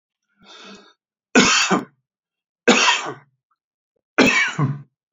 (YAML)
three_cough_length: 5.1 s
three_cough_amplitude: 29148
three_cough_signal_mean_std_ratio: 0.42
survey_phase: alpha (2021-03-01 to 2021-08-12)
age: 45-64
gender: Male
wearing_mask: 'No'
symptom_none: true
smoker_status: Never smoked
respiratory_condition_asthma: false
respiratory_condition_other: false
recruitment_source: REACT
submission_delay: 3 days
covid_test_result: Negative
covid_test_method: RT-qPCR